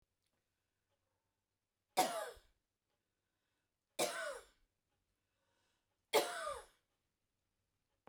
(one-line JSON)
{"three_cough_length": "8.1 s", "three_cough_amplitude": 4111, "three_cough_signal_mean_std_ratio": 0.26, "survey_phase": "beta (2021-08-13 to 2022-03-07)", "age": "65+", "gender": "Female", "wearing_mask": "No", "symptom_none": true, "smoker_status": "Ex-smoker", "respiratory_condition_asthma": true, "respiratory_condition_other": false, "recruitment_source": "REACT", "submission_delay": "1 day", "covid_test_result": "Negative", "covid_test_method": "RT-qPCR"}